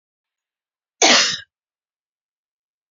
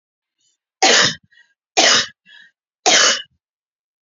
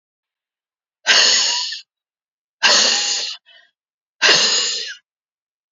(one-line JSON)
{"cough_length": "2.9 s", "cough_amplitude": 29343, "cough_signal_mean_std_ratio": 0.27, "three_cough_length": "4.0 s", "three_cough_amplitude": 32767, "three_cough_signal_mean_std_ratio": 0.4, "exhalation_length": "5.7 s", "exhalation_amplitude": 31475, "exhalation_signal_mean_std_ratio": 0.48, "survey_phase": "beta (2021-08-13 to 2022-03-07)", "age": "45-64", "gender": "Female", "wearing_mask": "No", "symptom_none": true, "smoker_status": "Never smoked", "respiratory_condition_asthma": false, "respiratory_condition_other": false, "recruitment_source": "REACT", "submission_delay": "8 days", "covid_test_result": "Negative", "covid_test_method": "RT-qPCR", "influenza_a_test_result": "Unknown/Void", "influenza_b_test_result": "Unknown/Void"}